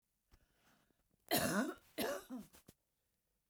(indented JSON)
{
  "cough_length": "3.5 s",
  "cough_amplitude": 2733,
  "cough_signal_mean_std_ratio": 0.38,
  "survey_phase": "beta (2021-08-13 to 2022-03-07)",
  "age": "65+",
  "gender": "Female",
  "wearing_mask": "No",
  "symptom_none": true,
  "smoker_status": "Ex-smoker",
  "respiratory_condition_asthma": false,
  "respiratory_condition_other": false,
  "recruitment_source": "REACT",
  "submission_delay": "1 day",
  "covid_test_result": "Negative",
  "covid_test_method": "RT-qPCR"
}